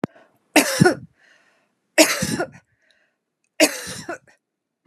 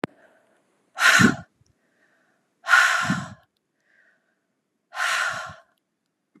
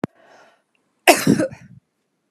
{
  "three_cough_length": "4.9 s",
  "three_cough_amplitude": 32426,
  "three_cough_signal_mean_std_ratio": 0.33,
  "exhalation_length": "6.4 s",
  "exhalation_amplitude": 24560,
  "exhalation_signal_mean_std_ratio": 0.35,
  "cough_length": "2.3 s",
  "cough_amplitude": 32768,
  "cough_signal_mean_std_ratio": 0.29,
  "survey_phase": "beta (2021-08-13 to 2022-03-07)",
  "age": "45-64",
  "gender": "Female",
  "wearing_mask": "No",
  "symptom_none": true,
  "smoker_status": "Ex-smoker",
  "respiratory_condition_asthma": true,
  "respiratory_condition_other": false,
  "recruitment_source": "REACT",
  "submission_delay": "1 day",
  "covid_test_result": "Negative",
  "covid_test_method": "RT-qPCR",
  "influenza_a_test_result": "Negative",
  "influenza_b_test_result": "Negative"
}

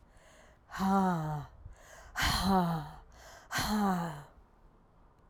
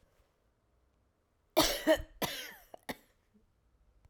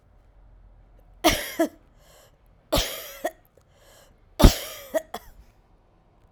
{
  "exhalation_length": "5.3 s",
  "exhalation_amplitude": 4484,
  "exhalation_signal_mean_std_ratio": 0.61,
  "cough_length": "4.1 s",
  "cough_amplitude": 7391,
  "cough_signal_mean_std_ratio": 0.28,
  "three_cough_length": "6.3 s",
  "three_cough_amplitude": 32767,
  "three_cough_signal_mean_std_ratio": 0.25,
  "survey_phase": "beta (2021-08-13 to 2022-03-07)",
  "age": "45-64",
  "gender": "Female",
  "wearing_mask": "No",
  "symptom_cough_any": true,
  "symptom_new_continuous_cough": true,
  "symptom_runny_or_blocked_nose": true,
  "symptom_sore_throat": true,
  "symptom_fatigue": true,
  "symptom_fever_high_temperature": true,
  "symptom_onset": "3 days",
  "smoker_status": "Ex-smoker",
  "respiratory_condition_asthma": false,
  "respiratory_condition_other": false,
  "recruitment_source": "Test and Trace",
  "submission_delay": "2 days",
  "covid_test_result": "Positive",
  "covid_test_method": "RT-qPCR"
}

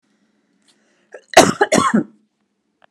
{
  "cough_length": "2.9 s",
  "cough_amplitude": 32768,
  "cough_signal_mean_std_ratio": 0.31,
  "survey_phase": "beta (2021-08-13 to 2022-03-07)",
  "age": "45-64",
  "gender": "Female",
  "wearing_mask": "No",
  "symptom_none": true,
  "symptom_onset": "12 days",
  "smoker_status": "Ex-smoker",
  "respiratory_condition_asthma": false,
  "respiratory_condition_other": false,
  "recruitment_source": "REACT",
  "submission_delay": "2 days",
  "covid_test_result": "Negative",
  "covid_test_method": "RT-qPCR"
}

